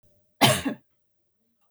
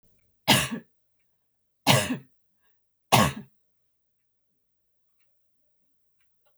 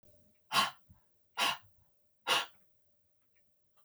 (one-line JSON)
{"cough_length": "1.7 s", "cough_amplitude": 22211, "cough_signal_mean_std_ratio": 0.3, "three_cough_length": "6.6 s", "three_cough_amplitude": 21550, "three_cough_signal_mean_std_ratio": 0.26, "exhalation_length": "3.8 s", "exhalation_amplitude": 5387, "exhalation_signal_mean_std_ratio": 0.33, "survey_phase": "beta (2021-08-13 to 2022-03-07)", "age": "45-64", "gender": "Female", "wearing_mask": "No", "symptom_none": true, "smoker_status": "Ex-smoker", "respiratory_condition_asthma": true, "respiratory_condition_other": false, "recruitment_source": "REACT", "submission_delay": "1 day", "covid_test_result": "Negative", "covid_test_method": "RT-qPCR", "influenza_a_test_result": "Negative", "influenza_b_test_result": "Negative"}